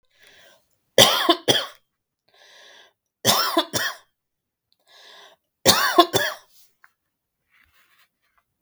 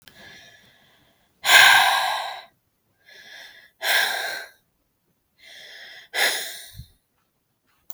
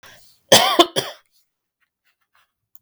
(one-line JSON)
{"three_cough_length": "8.6 s", "three_cough_amplitude": 32768, "three_cough_signal_mean_std_ratio": 0.31, "exhalation_length": "7.9 s", "exhalation_amplitude": 32768, "exhalation_signal_mean_std_ratio": 0.35, "cough_length": "2.8 s", "cough_amplitude": 32768, "cough_signal_mean_std_ratio": 0.27, "survey_phase": "beta (2021-08-13 to 2022-03-07)", "age": "18-44", "gender": "Female", "wearing_mask": "No", "symptom_runny_or_blocked_nose": true, "symptom_shortness_of_breath": true, "symptom_sore_throat": true, "symptom_fatigue": true, "symptom_headache": true, "symptom_onset": "3 days", "smoker_status": "Never smoked", "respiratory_condition_asthma": false, "respiratory_condition_other": false, "recruitment_source": "Test and Trace", "submission_delay": "2 days", "covid_test_result": "Positive", "covid_test_method": "RT-qPCR", "covid_ct_value": 21.7, "covid_ct_gene": "N gene", "covid_ct_mean": 22.1, "covid_viral_load": "57000 copies/ml", "covid_viral_load_category": "Low viral load (10K-1M copies/ml)"}